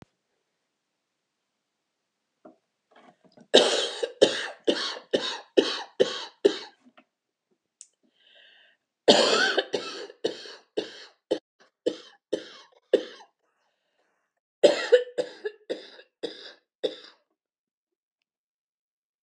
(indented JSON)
{
  "cough_length": "19.2 s",
  "cough_amplitude": 27888,
  "cough_signal_mean_std_ratio": 0.29,
  "survey_phase": "alpha (2021-03-01 to 2021-08-12)",
  "age": "65+",
  "gender": "Female",
  "wearing_mask": "No",
  "symptom_cough_any": true,
  "symptom_onset": "13 days",
  "smoker_status": "Never smoked",
  "respiratory_condition_asthma": false,
  "respiratory_condition_other": true,
  "recruitment_source": "REACT",
  "submission_delay": "2 days",
  "covid_test_result": "Negative",
  "covid_test_method": "RT-qPCR"
}